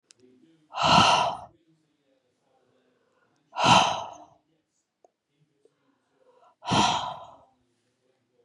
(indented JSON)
{
  "exhalation_length": "8.4 s",
  "exhalation_amplitude": 18957,
  "exhalation_signal_mean_std_ratio": 0.33,
  "survey_phase": "beta (2021-08-13 to 2022-03-07)",
  "age": "45-64",
  "gender": "Female",
  "wearing_mask": "No",
  "symptom_none": true,
  "smoker_status": "Ex-smoker",
  "respiratory_condition_asthma": true,
  "respiratory_condition_other": false,
  "recruitment_source": "REACT",
  "submission_delay": "1 day",
  "covid_test_result": "Negative",
  "covid_test_method": "RT-qPCR",
  "influenza_a_test_result": "Negative",
  "influenza_b_test_result": "Negative"
}